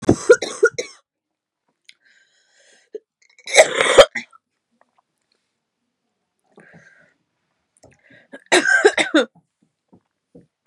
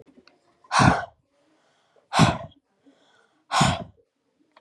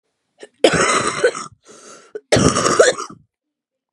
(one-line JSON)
{"three_cough_length": "10.7 s", "three_cough_amplitude": 32768, "three_cough_signal_mean_std_ratio": 0.26, "exhalation_length": "4.6 s", "exhalation_amplitude": 23874, "exhalation_signal_mean_std_ratio": 0.33, "cough_length": "3.9 s", "cough_amplitude": 32767, "cough_signal_mean_std_ratio": 0.47, "survey_phase": "beta (2021-08-13 to 2022-03-07)", "age": "18-44", "gender": "Female", "wearing_mask": "No", "symptom_new_continuous_cough": true, "symptom_runny_or_blocked_nose": true, "symptom_onset": "8 days", "smoker_status": "Never smoked", "respiratory_condition_asthma": false, "respiratory_condition_other": false, "recruitment_source": "REACT", "submission_delay": "4 days", "covid_test_result": "Negative", "covid_test_method": "RT-qPCR", "influenza_a_test_result": "Negative", "influenza_b_test_result": "Negative"}